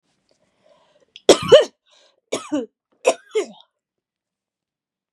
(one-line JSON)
{"three_cough_length": "5.1 s", "three_cough_amplitude": 32768, "three_cough_signal_mean_std_ratio": 0.23, "survey_phase": "beta (2021-08-13 to 2022-03-07)", "age": "18-44", "gender": "Female", "wearing_mask": "No", "symptom_runny_or_blocked_nose": true, "symptom_shortness_of_breath": true, "symptom_sore_throat": true, "symptom_fatigue": true, "symptom_headache": true, "symptom_onset": "2 days", "smoker_status": "Never smoked", "respiratory_condition_asthma": true, "respiratory_condition_other": false, "recruitment_source": "Test and Trace", "submission_delay": "0 days", "covid_test_result": "Negative", "covid_test_method": "ePCR"}